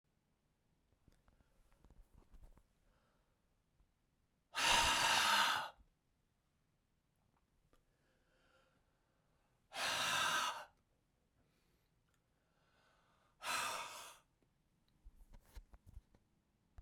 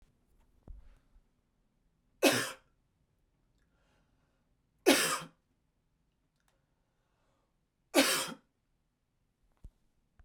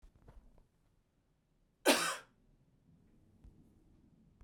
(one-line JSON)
{"exhalation_length": "16.8 s", "exhalation_amplitude": 3031, "exhalation_signal_mean_std_ratio": 0.32, "three_cough_length": "10.2 s", "three_cough_amplitude": 10177, "three_cough_signal_mean_std_ratio": 0.23, "cough_length": "4.4 s", "cough_amplitude": 6285, "cough_signal_mean_std_ratio": 0.23, "survey_phase": "beta (2021-08-13 to 2022-03-07)", "age": "18-44", "gender": "Male", "wearing_mask": "No", "symptom_cough_any": true, "symptom_runny_or_blocked_nose": true, "symptom_fatigue": true, "symptom_headache": true, "symptom_loss_of_taste": true, "smoker_status": "Never smoked", "respiratory_condition_asthma": false, "respiratory_condition_other": false, "recruitment_source": "Test and Trace", "submission_delay": "2 days", "covid_test_result": "Positive", "covid_test_method": "RT-qPCR"}